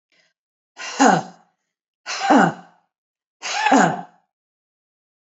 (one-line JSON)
{"exhalation_length": "5.3 s", "exhalation_amplitude": 27295, "exhalation_signal_mean_std_ratio": 0.37, "survey_phase": "alpha (2021-03-01 to 2021-08-12)", "age": "45-64", "gender": "Female", "wearing_mask": "No", "symptom_none": true, "smoker_status": "Ex-smoker", "respiratory_condition_asthma": true, "respiratory_condition_other": false, "recruitment_source": "REACT", "submission_delay": "2 days", "covid_test_result": "Negative", "covid_test_method": "RT-qPCR"}